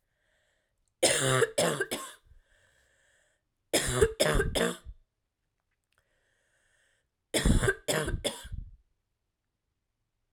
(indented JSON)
{
  "cough_length": "10.3 s",
  "cough_amplitude": 12139,
  "cough_signal_mean_std_ratio": 0.39,
  "survey_phase": "alpha (2021-03-01 to 2021-08-12)",
  "age": "18-44",
  "gender": "Female",
  "wearing_mask": "No",
  "symptom_cough_any": true,
  "symptom_new_continuous_cough": true,
  "symptom_fatigue": true,
  "symptom_fever_high_temperature": true,
  "symptom_change_to_sense_of_smell_or_taste": true,
  "symptom_loss_of_taste": true,
  "symptom_onset": "4 days",
  "smoker_status": "Never smoked",
  "respiratory_condition_asthma": false,
  "respiratory_condition_other": false,
  "recruitment_source": "Test and Trace",
  "submission_delay": "2 days",
  "covid_test_result": "Positive",
  "covid_test_method": "RT-qPCR"
}